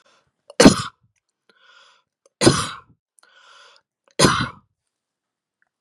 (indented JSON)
{
  "three_cough_length": "5.8 s",
  "three_cough_amplitude": 32768,
  "three_cough_signal_mean_std_ratio": 0.24,
  "survey_phase": "beta (2021-08-13 to 2022-03-07)",
  "age": "45-64",
  "gender": "Female",
  "wearing_mask": "No",
  "symptom_none": true,
  "smoker_status": "Never smoked",
  "respiratory_condition_asthma": false,
  "respiratory_condition_other": true,
  "recruitment_source": "REACT",
  "submission_delay": "2 days",
  "covid_test_result": "Negative",
  "covid_test_method": "RT-qPCR",
  "influenza_a_test_result": "Negative",
  "influenza_b_test_result": "Negative"
}